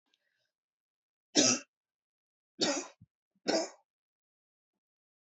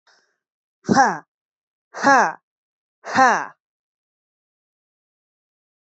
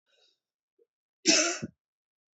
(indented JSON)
{
  "three_cough_length": "5.4 s",
  "three_cough_amplitude": 9047,
  "three_cough_signal_mean_std_ratio": 0.26,
  "exhalation_length": "5.8 s",
  "exhalation_amplitude": 28329,
  "exhalation_signal_mean_std_ratio": 0.28,
  "cough_length": "2.4 s",
  "cough_amplitude": 11882,
  "cough_signal_mean_std_ratio": 0.28,
  "survey_phase": "beta (2021-08-13 to 2022-03-07)",
  "age": "18-44",
  "gender": "Female",
  "wearing_mask": "No",
  "symptom_runny_or_blocked_nose": true,
  "symptom_fatigue": true,
  "symptom_headache": true,
  "symptom_change_to_sense_of_smell_or_taste": true,
  "symptom_other": true,
  "symptom_onset": "6 days",
  "smoker_status": "Current smoker (e-cigarettes or vapes only)",
  "respiratory_condition_asthma": false,
  "respiratory_condition_other": false,
  "recruitment_source": "Test and Trace",
  "submission_delay": "2 days",
  "covid_test_result": "Positive",
  "covid_test_method": "LAMP"
}